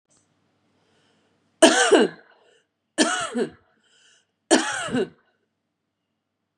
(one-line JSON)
{"three_cough_length": "6.6 s", "three_cough_amplitude": 32767, "three_cough_signal_mean_std_ratio": 0.33, "survey_phase": "beta (2021-08-13 to 2022-03-07)", "age": "45-64", "gender": "Female", "wearing_mask": "No", "symptom_runny_or_blocked_nose": true, "symptom_sore_throat": true, "symptom_headache": true, "smoker_status": "Never smoked", "respiratory_condition_asthma": false, "respiratory_condition_other": false, "recruitment_source": "REACT", "submission_delay": "2 days", "covid_test_result": "Negative", "covid_test_method": "RT-qPCR", "influenza_a_test_result": "Negative", "influenza_b_test_result": "Negative"}